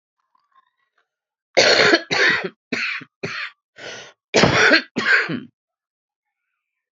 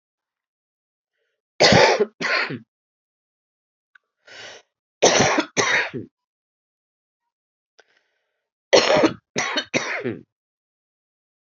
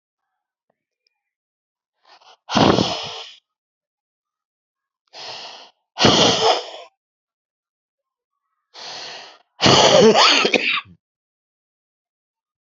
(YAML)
cough_length: 6.9 s
cough_amplitude: 31136
cough_signal_mean_std_ratio: 0.43
three_cough_length: 11.4 s
three_cough_amplitude: 32767
three_cough_signal_mean_std_ratio: 0.35
exhalation_length: 12.6 s
exhalation_amplitude: 32768
exhalation_signal_mean_std_ratio: 0.35
survey_phase: beta (2021-08-13 to 2022-03-07)
age: 45-64
gender: Female
wearing_mask: 'No'
symptom_cough_any: true
symptom_runny_or_blocked_nose: true
symptom_abdominal_pain: true
symptom_diarrhoea: true
symptom_fatigue: true
symptom_headache: true
symptom_change_to_sense_of_smell_or_taste: true
symptom_loss_of_taste: true
symptom_onset: 6 days
smoker_status: Current smoker (1 to 10 cigarettes per day)
respiratory_condition_asthma: false
respiratory_condition_other: false
recruitment_source: Test and Trace
submission_delay: 1 day
covid_test_result: Positive
covid_test_method: RT-qPCR
covid_ct_value: 17.2
covid_ct_gene: S gene